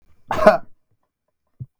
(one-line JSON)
{"cough_length": "1.8 s", "cough_amplitude": 32766, "cough_signal_mean_std_ratio": 0.3, "survey_phase": "beta (2021-08-13 to 2022-03-07)", "age": "18-44", "gender": "Male", "wearing_mask": "No", "symptom_none": true, "smoker_status": "Never smoked", "respiratory_condition_asthma": false, "respiratory_condition_other": false, "recruitment_source": "REACT", "submission_delay": "0 days", "covid_test_result": "Negative", "covid_test_method": "RT-qPCR", "influenza_a_test_result": "Negative", "influenza_b_test_result": "Negative"}